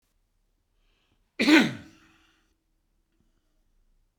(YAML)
cough_length: 4.2 s
cough_amplitude: 16927
cough_signal_mean_std_ratio: 0.22
survey_phase: beta (2021-08-13 to 2022-03-07)
age: 65+
gender: Male
wearing_mask: 'No'
symptom_none: true
smoker_status: Never smoked
respiratory_condition_asthma: false
respiratory_condition_other: false
recruitment_source: REACT
submission_delay: 1 day
covid_test_result: Negative
covid_test_method: RT-qPCR